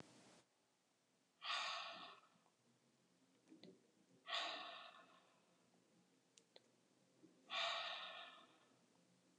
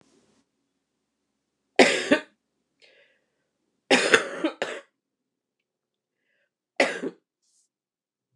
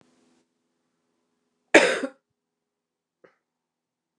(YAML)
exhalation_length: 9.4 s
exhalation_amplitude: 1012
exhalation_signal_mean_std_ratio: 0.43
three_cough_length: 8.4 s
three_cough_amplitude: 29204
three_cough_signal_mean_std_ratio: 0.25
cough_length: 4.2 s
cough_amplitude: 29203
cough_signal_mean_std_ratio: 0.17
survey_phase: alpha (2021-03-01 to 2021-08-12)
age: 45-64
gender: Female
wearing_mask: 'No'
symptom_cough_any: true
symptom_fatigue: true
symptom_fever_high_temperature: true
symptom_onset: 5 days
smoker_status: Ex-smoker
respiratory_condition_asthma: false
respiratory_condition_other: false
recruitment_source: Test and Trace
submission_delay: 2 days
covid_test_result: Positive
covid_test_method: RT-qPCR